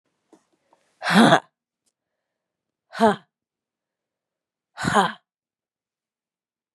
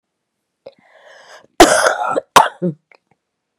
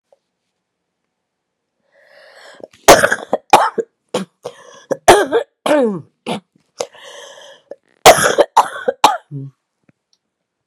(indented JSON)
{
  "exhalation_length": "6.7 s",
  "exhalation_amplitude": 31336,
  "exhalation_signal_mean_std_ratio": 0.25,
  "cough_length": "3.6 s",
  "cough_amplitude": 32768,
  "cough_signal_mean_std_ratio": 0.33,
  "three_cough_length": "10.7 s",
  "three_cough_amplitude": 32768,
  "three_cough_signal_mean_std_ratio": 0.32,
  "survey_phase": "beta (2021-08-13 to 2022-03-07)",
  "age": "45-64",
  "gender": "Female",
  "wearing_mask": "No",
  "symptom_cough_any": true,
  "symptom_runny_or_blocked_nose": true,
  "symptom_fatigue": true,
  "symptom_fever_high_temperature": true,
  "smoker_status": "Ex-smoker",
  "respiratory_condition_asthma": false,
  "respiratory_condition_other": false,
  "recruitment_source": "Test and Trace",
  "submission_delay": "2 days",
  "covid_test_result": "Positive",
  "covid_test_method": "RT-qPCR",
  "covid_ct_value": 25.3,
  "covid_ct_gene": "ORF1ab gene"
}